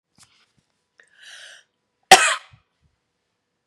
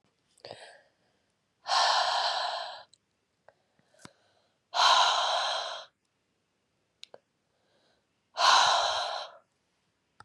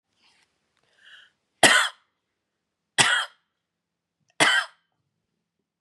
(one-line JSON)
{"cough_length": "3.7 s", "cough_amplitude": 32768, "cough_signal_mean_std_ratio": 0.17, "exhalation_length": "10.2 s", "exhalation_amplitude": 11807, "exhalation_signal_mean_std_ratio": 0.42, "three_cough_length": "5.8 s", "three_cough_amplitude": 28960, "three_cough_signal_mean_std_ratio": 0.27, "survey_phase": "beta (2021-08-13 to 2022-03-07)", "age": "45-64", "gender": "Female", "wearing_mask": "No", "symptom_cough_any": true, "symptom_runny_or_blocked_nose": true, "symptom_sore_throat": true, "symptom_abdominal_pain": true, "symptom_fatigue": true, "symptom_headache": true, "symptom_change_to_sense_of_smell_or_taste": true, "symptom_onset": "3 days", "smoker_status": "Never smoked", "respiratory_condition_asthma": true, "respiratory_condition_other": false, "recruitment_source": "Test and Trace", "submission_delay": "2 days", "covid_test_result": "Positive", "covid_test_method": "RT-qPCR", "covid_ct_value": 27.8, "covid_ct_gene": "N gene", "covid_ct_mean": 27.9, "covid_viral_load": "690 copies/ml", "covid_viral_load_category": "Minimal viral load (< 10K copies/ml)"}